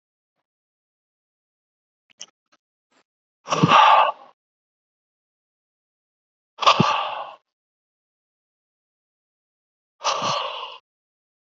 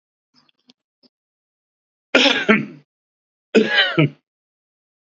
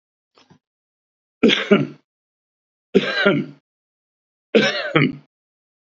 {"exhalation_length": "11.5 s", "exhalation_amplitude": 26269, "exhalation_signal_mean_std_ratio": 0.27, "cough_length": "5.1 s", "cough_amplitude": 29894, "cough_signal_mean_std_ratio": 0.33, "three_cough_length": "5.9 s", "three_cough_amplitude": 30380, "three_cough_signal_mean_std_ratio": 0.36, "survey_phase": "alpha (2021-03-01 to 2021-08-12)", "age": "65+", "gender": "Male", "wearing_mask": "No", "symptom_none": true, "smoker_status": "Ex-smoker", "respiratory_condition_asthma": false, "respiratory_condition_other": false, "recruitment_source": "REACT", "submission_delay": "1 day", "covid_test_result": "Negative", "covid_test_method": "RT-qPCR"}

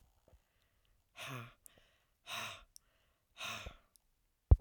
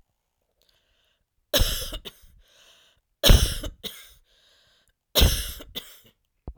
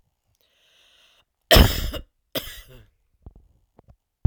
{"exhalation_length": "4.6 s", "exhalation_amplitude": 8318, "exhalation_signal_mean_std_ratio": 0.17, "three_cough_length": "6.6 s", "three_cough_amplitude": 25746, "three_cough_signal_mean_std_ratio": 0.3, "cough_length": "4.3 s", "cough_amplitude": 32767, "cough_signal_mean_std_ratio": 0.24, "survey_phase": "beta (2021-08-13 to 2022-03-07)", "age": "45-64", "gender": "Female", "wearing_mask": "No", "symptom_none": true, "smoker_status": "Ex-smoker", "respiratory_condition_asthma": false, "respiratory_condition_other": false, "recruitment_source": "REACT", "submission_delay": "2 days", "covid_test_result": "Negative", "covid_test_method": "RT-qPCR"}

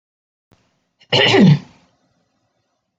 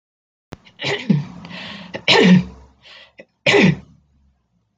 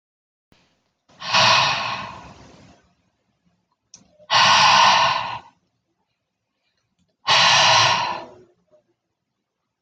{"cough_length": "3.0 s", "cough_amplitude": 26816, "cough_signal_mean_std_ratio": 0.33, "three_cough_length": "4.8 s", "three_cough_amplitude": 32767, "three_cough_signal_mean_std_ratio": 0.4, "exhalation_length": "9.8 s", "exhalation_amplitude": 25799, "exhalation_signal_mean_std_ratio": 0.43, "survey_phase": "beta (2021-08-13 to 2022-03-07)", "age": "45-64", "gender": "Female", "wearing_mask": "No", "symptom_runny_or_blocked_nose": true, "smoker_status": "Never smoked", "respiratory_condition_asthma": false, "respiratory_condition_other": false, "recruitment_source": "REACT", "submission_delay": "1 day", "covid_test_result": "Negative", "covid_test_method": "RT-qPCR"}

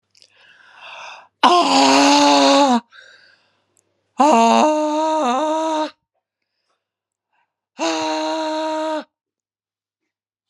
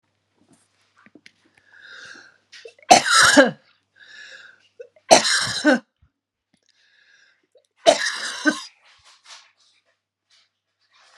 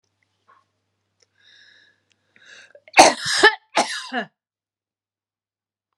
{"exhalation_length": "10.5 s", "exhalation_amplitude": 32600, "exhalation_signal_mean_std_ratio": 0.53, "three_cough_length": "11.2 s", "three_cough_amplitude": 32768, "three_cough_signal_mean_std_ratio": 0.28, "cough_length": "6.0 s", "cough_amplitude": 32768, "cough_signal_mean_std_ratio": 0.24, "survey_phase": "beta (2021-08-13 to 2022-03-07)", "age": "45-64", "gender": "Female", "wearing_mask": "No", "symptom_none": true, "symptom_onset": "3 days", "smoker_status": "Never smoked", "respiratory_condition_asthma": true, "respiratory_condition_other": false, "recruitment_source": "REACT", "submission_delay": "5 days", "covid_test_result": "Negative", "covid_test_method": "RT-qPCR"}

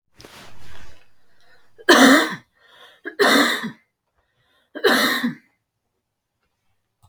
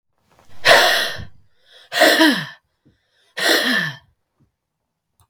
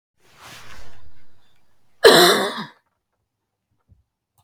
{"three_cough_length": "7.1 s", "three_cough_amplitude": 32767, "three_cough_signal_mean_std_ratio": 0.39, "exhalation_length": "5.3 s", "exhalation_amplitude": 32768, "exhalation_signal_mean_std_ratio": 0.45, "cough_length": "4.4 s", "cough_amplitude": 32768, "cough_signal_mean_std_ratio": 0.34, "survey_phase": "beta (2021-08-13 to 2022-03-07)", "age": "45-64", "gender": "Female", "wearing_mask": "No", "symptom_cough_any": true, "symptom_runny_or_blocked_nose": true, "symptom_sore_throat": true, "symptom_fatigue": true, "symptom_headache": true, "symptom_change_to_sense_of_smell_or_taste": true, "symptom_loss_of_taste": true, "symptom_onset": "5 days", "smoker_status": "Never smoked", "respiratory_condition_asthma": false, "respiratory_condition_other": false, "recruitment_source": "Test and Trace", "submission_delay": "2 days", "covid_test_result": "Positive", "covid_test_method": "RT-qPCR"}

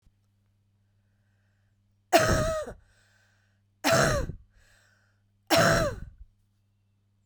{"three_cough_length": "7.3 s", "three_cough_amplitude": 16476, "three_cough_signal_mean_std_ratio": 0.36, "survey_phase": "beta (2021-08-13 to 2022-03-07)", "age": "18-44", "gender": "Female", "wearing_mask": "No", "symptom_cough_any": true, "symptom_runny_or_blocked_nose": true, "symptom_shortness_of_breath": true, "symptom_diarrhoea": true, "symptom_other": true, "smoker_status": "Never smoked", "respiratory_condition_asthma": true, "respiratory_condition_other": false, "recruitment_source": "Test and Trace", "submission_delay": "1 day", "covid_test_result": "Positive", "covid_test_method": "LFT"}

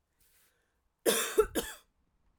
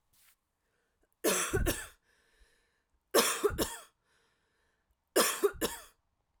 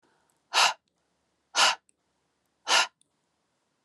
{"cough_length": "2.4 s", "cough_amplitude": 7749, "cough_signal_mean_std_ratio": 0.34, "three_cough_length": "6.4 s", "three_cough_amplitude": 9349, "three_cough_signal_mean_std_ratio": 0.38, "exhalation_length": "3.8 s", "exhalation_amplitude": 13085, "exhalation_signal_mean_std_ratio": 0.3, "survey_phase": "alpha (2021-03-01 to 2021-08-12)", "age": "18-44", "gender": "Female", "wearing_mask": "No", "symptom_none": true, "symptom_onset": "7 days", "smoker_status": "Never smoked", "respiratory_condition_asthma": false, "respiratory_condition_other": false, "recruitment_source": "REACT", "submission_delay": "1 day", "covid_test_result": "Negative", "covid_test_method": "RT-qPCR"}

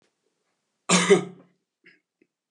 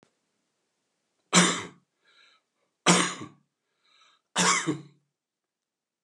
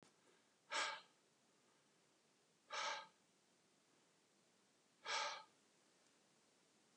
{"cough_length": "2.5 s", "cough_amplitude": 21127, "cough_signal_mean_std_ratio": 0.28, "three_cough_length": "6.0 s", "three_cough_amplitude": 17701, "three_cough_signal_mean_std_ratio": 0.3, "exhalation_length": "7.0 s", "exhalation_amplitude": 995, "exhalation_signal_mean_std_ratio": 0.34, "survey_phase": "alpha (2021-03-01 to 2021-08-12)", "age": "65+", "gender": "Male", "wearing_mask": "No", "symptom_none": true, "smoker_status": "Never smoked", "respiratory_condition_asthma": false, "respiratory_condition_other": false, "recruitment_source": "REACT", "submission_delay": "1 day", "covid_test_result": "Negative", "covid_test_method": "RT-qPCR"}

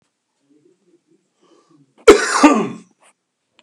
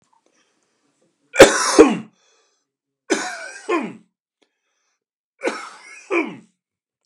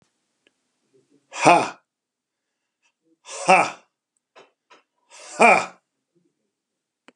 {"cough_length": "3.6 s", "cough_amplitude": 32768, "cough_signal_mean_std_ratio": 0.28, "three_cough_length": "7.1 s", "three_cough_amplitude": 32768, "three_cough_signal_mean_std_ratio": 0.27, "exhalation_length": "7.2 s", "exhalation_amplitude": 32767, "exhalation_signal_mean_std_ratio": 0.24, "survey_phase": "beta (2021-08-13 to 2022-03-07)", "age": "45-64", "gender": "Male", "wearing_mask": "No", "symptom_none": true, "smoker_status": "Never smoked", "respiratory_condition_asthma": false, "respiratory_condition_other": false, "recruitment_source": "REACT", "submission_delay": "1 day", "covid_test_result": "Negative", "covid_test_method": "RT-qPCR", "influenza_a_test_result": "Negative", "influenza_b_test_result": "Negative"}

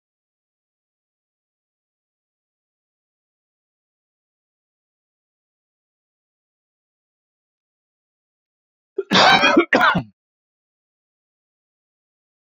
{"cough_length": "12.5 s", "cough_amplitude": 27758, "cough_signal_mean_std_ratio": 0.2, "survey_phase": "beta (2021-08-13 to 2022-03-07)", "age": "45-64", "gender": "Male", "wearing_mask": "No", "symptom_none": true, "smoker_status": "Ex-smoker", "respiratory_condition_asthma": false, "respiratory_condition_other": false, "recruitment_source": "REACT", "submission_delay": "5 days", "covid_test_result": "Negative", "covid_test_method": "RT-qPCR"}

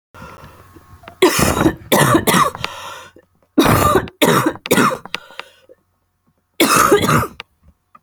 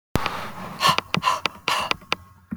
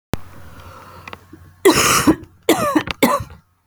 {"three_cough_length": "8.0 s", "three_cough_amplitude": 32768, "three_cough_signal_mean_std_ratio": 0.52, "exhalation_length": "2.6 s", "exhalation_amplitude": 27194, "exhalation_signal_mean_std_ratio": 0.52, "cough_length": "3.7 s", "cough_amplitude": 32768, "cough_signal_mean_std_ratio": 0.47, "survey_phase": "beta (2021-08-13 to 2022-03-07)", "age": "18-44", "gender": "Female", "wearing_mask": "No", "symptom_cough_any": true, "symptom_loss_of_taste": true, "symptom_onset": "4 days", "smoker_status": "Never smoked", "respiratory_condition_asthma": false, "respiratory_condition_other": false, "recruitment_source": "Test and Trace", "submission_delay": "3 days", "covid_test_result": "Positive", "covid_test_method": "RT-qPCR", "covid_ct_value": 18.6, "covid_ct_gene": "ORF1ab gene"}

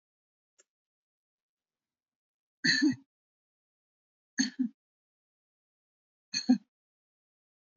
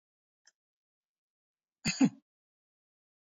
{"three_cough_length": "7.8 s", "three_cough_amplitude": 6895, "three_cough_signal_mean_std_ratio": 0.22, "cough_length": "3.2 s", "cough_amplitude": 6487, "cough_signal_mean_std_ratio": 0.18, "survey_phase": "beta (2021-08-13 to 2022-03-07)", "age": "45-64", "gender": "Female", "wearing_mask": "No", "symptom_none": true, "smoker_status": "Never smoked", "respiratory_condition_asthma": false, "respiratory_condition_other": false, "recruitment_source": "Test and Trace", "submission_delay": "2 days", "covid_test_result": "Negative", "covid_test_method": "RT-qPCR"}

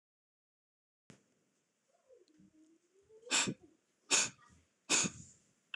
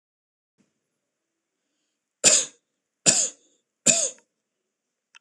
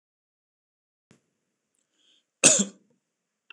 {"exhalation_length": "5.8 s", "exhalation_amplitude": 4994, "exhalation_signal_mean_std_ratio": 0.28, "three_cough_length": "5.2 s", "three_cough_amplitude": 26028, "three_cough_signal_mean_std_ratio": 0.26, "cough_length": "3.5 s", "cough_amplitude": 26025, "cough_signal_mean_std_ratio": 0.18, "survey_phase": "beta (2021-08-13 to 2022-03-07)", "age": "18-44", "gender": "Male", "wearing_mask": "No", "symptom_none": true, "smoker_status": "Never smoked", "respiratory_condition_asthma": false, "respiratory_condition_other": false, "recruitment_source": "Test and Trace", "submission_delay": "2 days", "covid_test_result": "Positive", "covid_test_method": "ePCR"}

